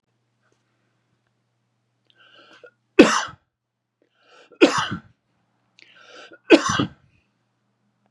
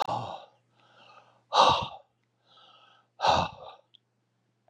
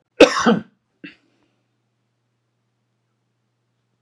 {"three_cough_length": "8.1 s", "three_cough_amplitude": 32768, "three_cough_signal_mean_std_ratio": 0.22, "exhalation_length": "4.7 s", "exhalation_amplitude": 14812, "exhalation_signal_mean_std_ratio": 0.33, "cough_length": "4.0 s", "cough_amplitude": 32768, "cough_signal_mean_std_ratio": 0.2, "survey_phase": "beta (2021-08-13 to 2022-03-07)", "age": "65+", "gender": "Male", "wearing_mask": "No", "symptom_cough_any": true, "symptom_fatigue": true, "symptom_change_to_sense_of_smell_or_taste": true, "symptom_onset": "2 days", "smoker_status": "Ex-smoker", "respiratory_condition_asthma": false, "respiratory_condition_other": false, "recruitment_source": "Test and Trace", "submission_delay": "1 day", "covid_test_result": "Positive", "covid_test_method": "ePCR"}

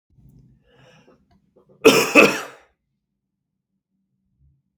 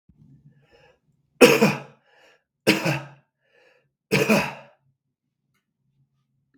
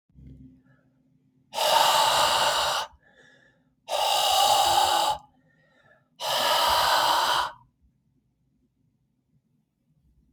{"cough_length": "4.8 s", "cough_amplitude": 32768, "cough_signal_mean_std_ratio": 0.24, "three_cough_length": "6.6 s", "three_cough_amplitude": 32768, "three_cough_signal_mean_std_ratio": 0.28, "exhalation_length": "10.3 s", "exhalation_amplitude": 14595, "exhalation_signal_mean_std_ratio": 0.55, "survey_phase": "beta (2021-08-13 to 2022-03-07)", "age": "45-64", "gender": "Male", "wearing_mask": "No", "symptom_shortness_of_breath": true, "symptom_fatigue": true, "symptom_change_to_sense_of_smell_or_taste": true, "symptom_other": true, "symptom_onset": "5 days", "smoker_status": "Never smoked", "respiratory_condition_asthma": false, "respiratory_condition_other": false, "recruitment_source": "Test and Trace", "submission_delay": "2 days", "covid_test_result": "Positive", "covid_test_method": "RT-qPCR", "covid_ct_value": 19.7, "covid_ct_gene": "ORF1ab gene"}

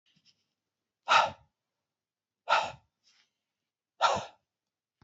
{"exhalation_length": "5.0 s", "exhalation_amplitude": 10010, "exhalation_signal_mean_std_ratio": 0.27, "survey_phase": "beta (2021-08-13 to 2022-03-07)", "age": "65+", "gender": "Male", "wearing_mask": "No", "symptom_none": true, "smoker_status": "Never smoked", "respiratory_condition_asthma": false, "respiratory_condition_other": false, "recruitment_source": "REACT", "submission_delay": "2 days", "covid_test_result": "Negative", "covid_test_method": "RT-qPCR"}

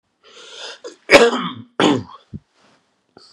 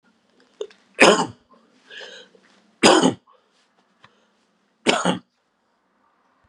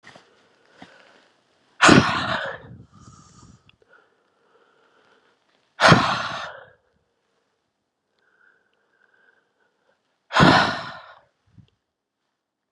{"cough_length": "3.3 s", "cough_amplitude": 32768, "cough_signal_mean_std_ratio": 0.33, "three_cough_length": "6.5 s", "three_cough_amplitude": 32767, "three_cough_signal_mean_std_ratio": 0.28, "exhalation_length": "12.7 s", "exhalation_amplitude": 32768, "exhalation_signal_mean_std_ratio": 0.26, "survey_phase": "beta (2021-08-13 to 2022-03-07)", "age": "45-64", "gender": "Male", "wearing_mask": "No", "symptom_cough_any": true, "symptom_runny_or_blocked_nose": true, "symptom_sore_throat": true, "symptom_fatigue": true, "symptom_headache": true, "symptom_other": true, "symptom_onset": "3 days", "smoker_status": "Ex-smoker", "respiratory_condition_asthma": false, "respiratory_condition_other": false, "recruitment_source": "Test and Trace", "submission_delay": "1 day", "covid_test_result": "Positive", "covid_test_method": "RT-qPCR", "covid_ct_value": 24.3, "covid_ct_gene": "ORF1ab gene"}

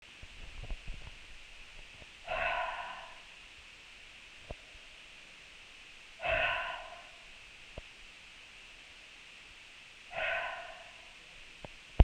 {"exhalation_length": "12.0 s", "exhalation_amplitude": 14575, "exhalation_signal_mean_std_ratio": 0.41, "survey_phase": "beta (2021-08-13 to 2022-03-07)", "age": "18-44", "gender": "Female", "wearing_mask": "No", "symptom_cough_any": true, "symptom_runny_or_blocked_nose": true, "symptom_fatigue": true, "symptom_headache": true, "symptom_change_to_sense_of_smell_or_taste": true, "symptom_onset": "12 days", "smoker_status": "Never smoked", "respiratory_condition_asthma": false, "respiratory_condition_other": false, "recruitment_source": "Test and Trace", "submission_delay": "1 day", "covid_test_result": "Positive", "covid_test_method": "RT-qPCR"}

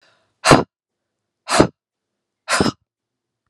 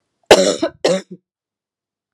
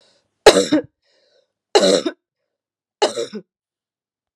{"exhalation_length": "3.5 s", "exhalation_amplitude": 32768, "exhalation_signal_mean_std_ratio": 0.28, "cough_length": "2.1 s", "cough_amplitude": 32768, "cough_signal_mean_std_ratio": 0.34, "three_cough_length": "4.4 s", "three_cough_amplitude": 32768, "three_cough_signal_mean_std_ratio": 0.3, "survey_phase": "beta (2021-08-13 to 2022-03-07)", "age": "65+", "gender": "Female", "wearing_mask": "No", "symptom_none": true, "smoker_status": "Ex-smoker", "respiratory_condition_asthma": false, "respiratory_condition_other": false, "recruitment_source": "REACT", "submission_delay": "1 day", "covid_test_result": "Negative", "covid_test_method": "RT-qPCR", "influenza_a_test_result": "Negative", "influenza_b_test_result": "Negative"}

